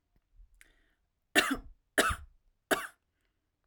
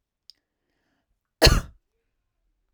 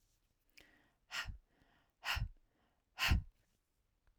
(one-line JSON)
{"three_cough_length": "3.7 s", "three_cough_amplitude": 12435, "three_cough_signal_mean_std_ratio": 0.28, "cough_length": "2.7 s", "cough_amplitude": 32156, "cough_signal_mean_std_ratio": 0.2, "exhalation_length": "4.2 s", "exhalation_amplitude": 2772, "exhalation_signal_mean_std_ratio": 0.3, "survey_phase": "beta (2021-08-13 to 2022-03-07)", "age": "18-44", "gender": "Female", "wearing_mask": "No", "symptom_cough_any": true, "smoker_status": "Never smoked", "respiratory_condition_asthma": false, "respiratory_condition_other": false, "recruitment_source": "Test and Trace", "submission_delay": "0 days", "covid_test_result": "Negative", "covid_test_method": "LFT"}